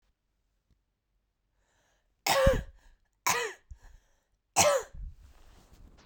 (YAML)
three_cough_length: 6.1 s
three_cough_amplitude: 12152
three_cough_signal_mean_std_ratio: 0.33
survey_phase: beta (2021-08-13 to 2022-03-07)
age: 18-44
gender: Female
wearing_mask: 'No'
symptom_none: true
smoker_status: Never smoked
respiratory_condition_asthma: false
respiratory_condition_other: false
recruitment_source: REACT
submission_delay: 1 day
covid_test_result: Negative
covid_test_method: RT-qPCR
influenza_a_test_result: Negative
influenza_b_test_result: Negative